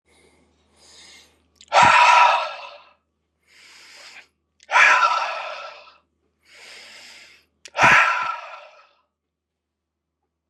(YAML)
exhalation_length: 10.5 s
exhalation_amplitude: 29273
exhalation_signal_mean_std_ratio: 0.37
survey_phase: beta (2021-08-13 to 2022-03-07)
age: 18-44
gender: Male
wearing_mask: 'No'
symptom_none: true
smoker_status: Current smoker (1 to 10 cigarettes per day)
respiratory_condition_asthma: false
respiratory_condition_other: false
recruitment_source: REACT
submission_delay: 4 days
covid_test_result: Negative
covid_test_method: RT-qPCR
influenza_a_test_result: Negative
influenza_b_test_result: Negative